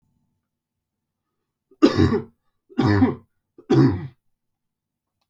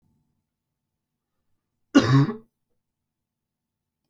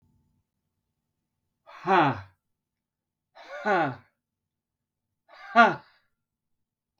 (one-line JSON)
{"three_cough_length": "5.3 s", "three_cough_amplitude": 27788, "three_cough_signal_mean_std_ratio": 0.35, "cough_length": "4.1 s", "cough_amplitude": 23009, "cough_signal_mean_std_ratio": 0.22, "exhalation_length": "7.0 s", "exhalation_amplitude": 19146, "exhalation_signal_mean_std_ratio": 0.26, "survey_phase": "beta (2021-08-13 to 2022-03-07)", "age": "18-44", "gender": "Male", "wearing_mask": "No", "symptom_none": true, "smoker_status": "Never smoked", "respiratory_condition_asthma": false, "respiratory_condition_other": false, "recruitment_source": "REACT", "submission_delay": "2 days", "covid_test_result": "Negative", "covid_test_method": "RT-qPCR"}